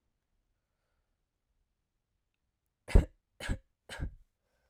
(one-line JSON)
{"three_cough_length": "4.7 s", "three_cough_amplitude": 13711, "three_cough_signal_mean_std_ratio": 0.16, "survey_phase": "alpha (2021-03-01 to 2021-08-12)", "age": "18-44", "gender": "Female", "wearing_mask": "No", "symptom_none": true, "symptom_onset": "7 days", "smoker_status": "Never smoked", "respiratory_condition_asthma": true, "respiratory_condition_other": false, "recruitment_source": "Test and Trace", "submission_delay": "2 days", "covid_test_result": "Positive", "covid_test_method": "RT-qPCR", "covid_ct_value": 20.5, "covid_ct_gene": "ORF1ab gene", "covid_ct_mean": 21.1, "covid_viral_load": "120000 copies/ml", "covid_viral_load_category": "Low viral load (10K-1M copies/ml)"}